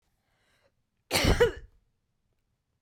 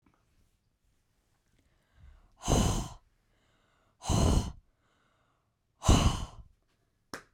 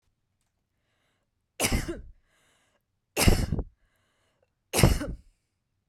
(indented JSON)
{
  "cough_length": "2.8 s",
  "cough_amplitude": 9831,
  "cough_signal_mean_std_ratio": 0.3,
  "exhalation_length": "7.3 s",
  "exhalation_amplitude": 12130,
  "exhalation_signal_mean_std_ratio": 0.32,
  "three_cough_length": "5.9 s",
  "three_cough_amplitude": 20739,
  "three_cough_signal_mean_std_ratio": 0.31,
  "survey_phase": "beta (2021-08-13 to 2022-03-07)",
  "age": "18-44",
  "gender": "Female",
  "wearing_mask": "No",
  "symptom_cough_any": true,
  "symptom_runny_or_blocked_nose": true,
  "symptom_sore_throat": true,
  "symptom_fatigue": true,
  "symptom_headache": true,
  "symptom_other": true,
  "smoker_status": "Ex-smoker",
  "respiratory_condition_asthma": false,
  "respiratory_condition_other": false,
  "recruitment_source": "Test and Trace",
  "submission_delay": "1 day",
  "covid_test_result": "Positive",
  "covid_test_method": "RT-qPCR",
  "covid_ct_value": 29.0,
  "covid_ct_gene": "N gene"
}